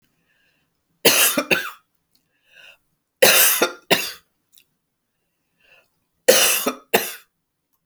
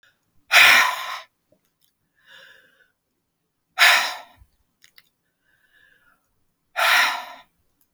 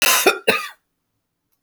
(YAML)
three_cough_length: 7.9 s
three_cough_amplitude: 32768
three_cough_signal_mean_std_ratio: 0.35
exhalation_length: 7.9 s
exhalation_amplitude: 30695
exhalation_signal_mean_std_ratio: 0.31
cough_length: 1.6 s
cough_amplitude: 29441
cough_signal_mean_std_ratio: 0.43
survey_phase: beta (2021-08-13 to 2022-03-07)
age: 65+
gender: Female
wearing_mask: 'No'
symptom_none: true
smoker_status: Ex-smoker
respiratory_condition_asthma: false
respiratory_condition_other: false
recruitment_source: REACT
submission_delay: 1 day
covid_test_result: Negative
covid_test_method: RT-qPCR